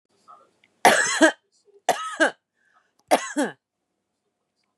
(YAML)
three_cough_length: 4.8 s
three_cough_amplitude: 27275
three_cough_signal_mean_std_ratio: 0.33
survey_phase: beta (2021-08-13 to 2022-03-07)
age: 45-64
gender: Female
wearing_mask: 'No'
symptom_none: true
smoker_status: Current smoker (11 or more cigarettes per day)
respiratory_condition_asthma: false
respiratory_condition_other: false
recruitment_source: REACT
submission_delay: 1 day
covid_test_result: Negative
covid_test_method: RT-qPCR